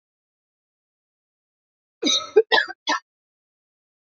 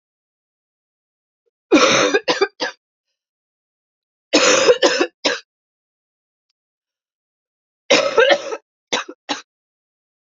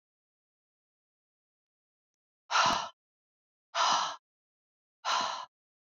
{
  "cough_length": "4.2 s",
  "cough_amplitude": 21561,
  "cough_signal_mean_std_ratio": 0.26,
  "three_cough_length": "10.3 s",
  "three_cough_amplitude": 30716,
  "three_cough_signal_mean_std_ratio": 0.35,
  "exhalation_length": "5.9 s",
  "exhalation_amplitude": 6932,
  "exhalation_signal_mean_std_ratio": 0.34,
  "survey_phase": "beta (2021-08-13 to 2022-03-07)",
  "age": "18-44",
  "gender": "Female",
  "wearing_mask": "No",
  "symptom_cough_any": true,
  "symptom_runny_or_blocked_nose": true,
  "symptom_shortness_of_breath": true,
  "symptom_sore_throat": true,
  "symptom_onset": "8 days",
  "smoker_status": "Never smoked",
  "respiratory_condition_asthma": false,
  "respiratory_condition_other": false,
  "recruitment_source": "Test and Trace",
  "submission_delay": "1 day",
  "covid_test_result": "Positive",
  "covid_test_method": "RT-qPCR",
  "covid_ct_value": 28.9,
  "covid_ct_gene": "ORF1ab gene"
}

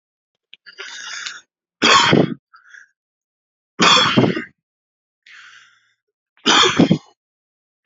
{
  "three_cough_length": "7.9 s",
  "three_cough_amplitude": 32768,
  "three_cough_signal_mean_std_ratio": 0.37,
  "survey_phase": "beta (2021-08-13 to 2022-03-07)",
  "age": "18-44",
  "gender": "Male",
  "wearing_mask": "No",
  "symptom_cough_any": true,
  "symptom_runny_or_blocked_nose": true,
  "symptom_sore_throat": true,
  "smoker_status": "Never smoked",
  "respiratory_condition_asthma": false,
  "respiratory_condition_other": false,
  "recruitment_source": "REACT",
  "submission_delay": "2 days",
  "covid_test_result": "Negative",
  "covid_test_method": "RT-qPCR"
}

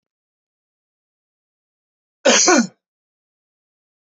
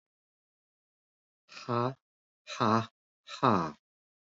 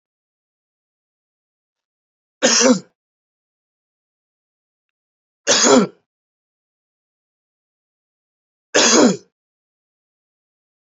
{
  "cough_length": "4.2 s",
  "cough_amplitude": 29298,
  "cough_signal_mean_std_ratio": 0.25,
  "exhalation_length": "4.4 s",
  "exhalation_amplitude": 9132,
  "exhalation_signal_mean_std_ratio": 0.32,
  "three_cough_length": "10.8 s",
  "three_cough_amplitude": 32768,
  "three_cough_signal_mean_std_ratio": 0.26,
  "survey_phase": "beta (2021-08-13 to 2022-03-07)",
  "age": "45-64",
  "gender": "Male",
  "wearing_mask": "No",
  "symptom_cough_any": true,
  "symptom_runny_or_blocked_nose": true,
  "symptom_change_to_sense_of_smell_or_taste": true,
  "smoker_status": "Never smoked",
  "respiratory_condition_asthma": false,
  "respiratory_condition_other": false,
  "recruitment_source": "Test and Trace",
  "submission_delay": "2 days",
  "covid_test_result": "Positive",
  "covid_test_method": "RT-qPCR"
}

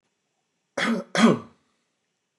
{
  "cough_length": "2.4 s",
  "cough_amplitude": 18032,
  "cough_signal_mean_std_ratio": 0.33,
  "survey_phase": "beta (2021-08-13 to 2022-03-07)",
  "age": "65+",
  "gender": "Male",
  "wearing_mask": "No",
  "symptom_none": true,
  "smoker_status": "Ex-smoker",
  "respiratory_condition_asthma": false,
  "respiratory_condition_other": false,
  "recruitment_source": "REACT",
  "submission_delay": "3 days",
  "covid_test_result": "Negative",
  "covid_test_method": "RT-qPCR",
  "influenza_a_test_result": "Negative",
  "influenza_b_test_result": "Negative"
}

